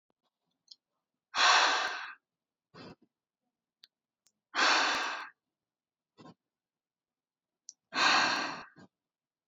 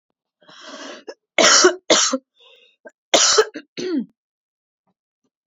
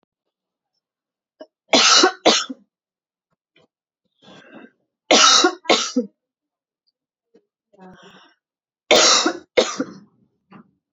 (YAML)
exhalation_length: 9.5 s
exhalation_amplitude: 8093
exhalation_signal_mean_std_ratio: 0.35
cough_length: 5.5 s
cough_amplitude: 31452
cough_signal_mean_std_ratio: 0.38
three_cough_length: 10.9 s
three_cough_amplitude: 32767
three_cough_signal_mean_std_ratio: 0.33
survey_phase: beta (2021-08-13 to 2022-03-07)
age: 18-44
gender: Female
wearing_mask: 'No'
symptom_none: true
smoker_status: Never smoked
respiratory_condition_asthma: false
respiratory_condition_other: false
recruitment_source: REACT
submission_delay: 1 day
covid_test_result: Negative
covid_test_method: RT-qPCR
influenza_a_test_result: Negative
influenza_b_test_result: Negative